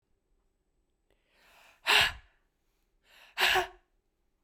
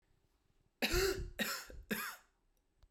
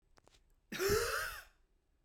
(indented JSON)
{
  "exhalation_length": "4.4 s",
  "exhalation_amplitude": 11645,
  "exhalation_signal_mean_std_ratio": 0.28,
  "three_cough_length": "2.9 s",
  "three_cough_amplitude": 3398,
  "three_cough_signal_mean_std_ratio": 0.47,
  "cough_length": "2.0 s",
  "cough_amplitude": 3027,
  "cough_signal_mean_std_ratio": 0.47,
  "survey_phase": "beta (2021-08-13 to 2022-03-07)",
  "age": "18-44",
  "gender": "Female",
  "wearing_mask": "No",
  "symptom_cough_any": true,
  "symptom_new_continuous_cough": true,
  "symptom_runny_or_blocked_nose": true,
  "symptom_sore_throat": true,
  "symptom_fatigue": true,
  "symptom_other": true,
  "symptom_onset": "4 days",
  "smoker_status": "Never smoked",
  "respiratory_condition_asthma": false,
  "respiratory_condition_other": false,
  "recruitment_source": "Test and Trace",
  "submission_delay": "2 days",
  "covid_test_result": "Negative",
  "covid_test_method": "RT-qPCR"
}